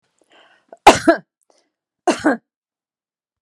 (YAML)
cough_length: 3.4 s
cough_amplitude: 32768
cough_signal_mean_std_ratio: 0.24
survey_phase: beta (2021-08-13 to 2022-03-07)
age: 45-64
gender: Female
wearing_mask: 'No'
symptom_none: true
smoker_status: Never smoked
respiratory_condition_asthma: false
respiratory_condition_other: false
recruitment_source: REACT
submission_delay: 1 day
covid_test_result: Negative
covid_test_method: RT-qPCR